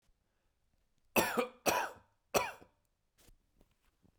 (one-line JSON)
{"three_cough_length": "4.2 s", "three_cough_amplitude": 7795, "three_cough_signal_mean_std_ratio": 0.31, "survey_phase": "beta (2021-08-13 to 2022-03-07)", "age": "18-44", "gender": "Male", "wearing_mask": "No", "symptom_none": true, "smoker_status": "Never smoked", "respiratory_condition_asthma": false, "respiratory_condition_other": false, "recruitment_source": "REACT", "submission_delay": "1 day", "covid_test_result": "Negative", "covid_test_method": "RT-qPCR", "influenza_a_test_result": "Negative", "influenza_b_test_result": "Negative"}